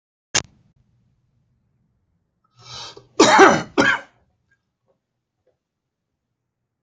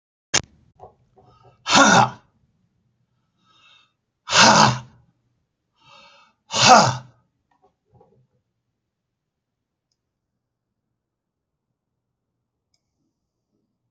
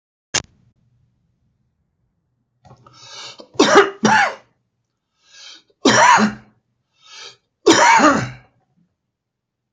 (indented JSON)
{
  "cough_length": "6.8 s",
  "cough_amplitude": 30968,
  "cough_signal_mean_std_ratio": 0.25,
  "exhalation_length": "13.9 s",
  "exhalation_amplitude": 31148,
  "exhalation_signal_mean_std_ratio": 0.24,
  "three_cough_length": "9.7 s",
  "three_cough_amplitude": 32767,
  "three_cough_signal_mean_std_ratio": 0.35,
  "survey_phase": "beta (2021-08-13 to 2022-03-07)",
  "age": "65+",
  "gender": "Male",
  "wearing_mask": "No",
  "symptom_none": true,
  "smoker_status": "Never smoked",
  "respiratory_condition_asthma": false,
  "respiratory_condition_other": false,
  "recruitment_source": "REACT",
  "submission_delay": "1 day",
  "covid_test_result": "Negative",
  "covid_test_method": "RT-qPCR",
  "influenza_a_test_result": "Negative",
  "influenza_b_test_result": "Negative"
}